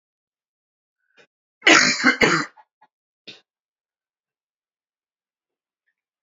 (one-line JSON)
{"cough_length": "6.2 s", "cough_amplitude": 30769, "cough_signal_mean_std_ratio": 0.25, "survey_phase": "beta (2021-08-13 to 2022-03-07)", "age": "18-44", "gender": "Male", "wearing_mask": "No", "symptom_fatigue": true, "symptom_fever_high_temperature": true, "symptom_headache": true, "symptom_change_to_sense_of_smell_or_taste": true, "symptom_loss_of_taste": true, "symptom_onset": "3 days", "smoker_status": "Never smoked", "respiratory_condition_asthma": false, "respiratory_condition_other": false, "recruitment_source": "Test and Trace", "submission_delay": "1 day", "covid_test_result": "Positive", "covid_test_method": "RT-qPCR", "covid_ct_value": 18.8, "covid_ct_gene": "ORF1ab gene", "covid_ct_mean": 19.4, "covid_viral_load": "430000 copies/ml", "covid_viral_load_category": "Low viral load (10K-1M copies/ml)"}